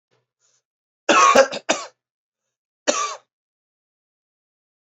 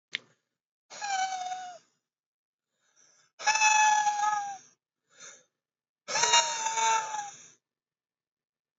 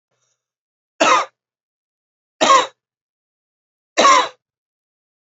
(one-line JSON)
{"cough_length": "4.9 s", "cough_amplitude": 28402, "cough_signal_mean_std_ratio": 0.29, "exhalation_length": "8.8 s", "exhalation_amplitude": 14785, "exhalation_signal_mean_std_ratio": 0.46, "three_cough_length": "5.4 s", "three_cough_amplitude": 28383, "three_cough_signal_mean_std_ratio": 0.31, "survey_phase": "alpha (2021-03-01 to 2021-08-12)", "age": "18-44", "gender": "Male", "wearing_mask": "No", "symptom_cough_any": true, "symptom_fever_high_temperature": true, "symptom_onset": "3 days", "smoker_status": "Never smoked", "respiratory_condition_asthma": false, "respiratory_condition_other": false, "recruitment_source": "Test and Trace", "submission_delay": "2 days", "covid_test_result": "Positive", "covid_test_method": "RT-qPCR", "covid_ct_value": 15.3, "covid_ct_gene": "ORF1ab gene"}